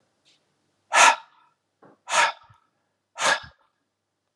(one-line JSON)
{"exhalation_length": "4.4 s", "exhalation_amplitude": 26979, "exhalation_signal_mean_std_ratio": 0.29, "survey_phase": "alpha (2021-03-01 to 2021-08-12)", "age": "45-64", "gender": "Male", "wearing_mask": "No", "symptom_cough_any": true, "smoker_status": "Ex-smoker", "respiratory_condition_asthma": false, "respiratory_condition_other": false, "recruitment_source": "Test and Trace", "submission_delay": "1 day", "covid_test_result": "Positive", "covid_test_method": "RT-qPCR", "covid_ct_value": 34.3, "covid_ct_gene": "ORF1ab gene"}